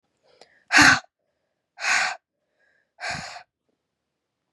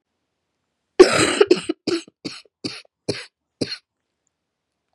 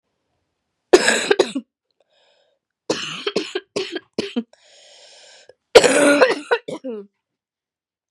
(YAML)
exhalation_length: 4.5 s
exhalation_amplitude: 29373
exhalation_signal_mean_std_ratio: 0.29
cough_length: 4.9 s
cough_amplitude: 32768
cough_signal_mean_std_ratio: 0.27
three_cough_length: 8.1 s
three_cough_amplitude: 32768
three_cough_signal_mean_std_ratio: 0.34
survey_phase: beta (2021-08-13 to 2022-03-07)
age: 18-44
gender: Female
wearing_mask: 'No'
symptom_cough_any: true
symptom_new_continuous_cough: true
symptom_runny_or_blocked_nose: true
symptom_shortness_of_breath: true
symptom_sore_throat: true
symptom_fatigue: true
symptom_headache: true
symptom_change_to_sense_of_smell_or_taste: true
symptom_loss_of_taste: true
symptom_onset: 5 days
smoker_status: Never smoked
respiratory_condition_asthma: false
respiratory_condition_other: false
recruitment_source: Test and Trace
submission_delay: 1 day
covid_test_result: Positive
covid_test_method: RT-qPCR